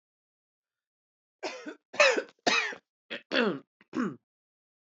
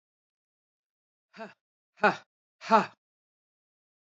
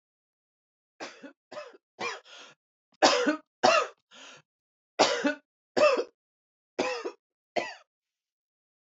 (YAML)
cough_length: 4.9 s
cough_amplitude: 15392
cough_signal_mean_std_ratio: 0.35
exhalation_length: 4.0 s
exhalation_amplitude: 14723
exhalation_signal_mean_std_ratio: 0.19
three_cough_length: 8.9 s
three_cough_amplitude: 18755
three_cough_signal_mean_std_ratio: 0.34
survey_phase: beta (2021-08-13 to 2022-03-07)
age: 18-44
gender: Female
wearing_mask: 'No'
symptom_cough_any: true
symptom_runny_or_blocked_nose: true
symptom_other: true
smoker_status: Ex-smoker
respiratory_condition_asthma: true
respiratory_condition_other: false
recruitment_source: Test and Trace
submission_delay: 2 days
covid_test_result: Positive
covid_test_method: ePCR